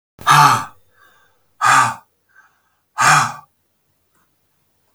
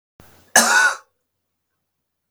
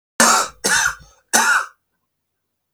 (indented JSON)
{
  "exhalation_length": "4.9 s",
  "exhalation_amplitude": 32768,
  "exhalation_signal_mean_std_ratio": 0.37,
  "cough_length": "2.3 s",
  "cough_amplitude": 32768,
  "cough_signal_mean_std_ratio": 0.33,
  "three_cough_length": "2.7 s",
  "three_cough_amplitude": 32768,
  "three_cough_signal_mean_std_ratio": 0.47,
  "survey_phase": "beta (2021-08-13 to 2022-03-07)",
  "age": "45-64",
  "gender": "Male",
  "wearing_mask": "No",
  "symptom_cough_any": true,
  "symptom_shortness_of_breath": true,
  "symptom_sore_throat": true,
  "symptom_fatigue": true,
  "symptom_fever_high_temperature": true,
  "symptom_headache": true,
  "smoker_status": "Ex-smoker",
  "respiratory_condition_asthma": false,
  "respiratory_condition_other": false,
  "recruitment_source": "Test and Trace",
  "submission_delay": "1 day",
  "covid_test_result": "Positive",
  "covid_test_method": "RT-qPCR",
  "covid_ct_value": 21.7,
  "covid_ct_gene": "N gene"
}